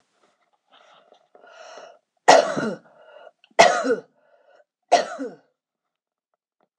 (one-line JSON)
{"three_cough_length": "6.8 s", "three_cough_amplitude": 26028, "three_cough_signal_mean_std_ratio": 0.27, "survey_phase": "alpha (2021-03-01 to 2021-08-12)", "age": "45-64", "gender": "Female", "wearing_mask": "No", "symptom_none": true, "smoker_status": "Ex-smoker", "respiratory_condition_asthma": true, "respiratory_condition_other": false, "recruitment_source": "REACT", "submission_delay": "1 day", "covid_test_result": "Negative", "covid_test_method": "RT-qPCR"}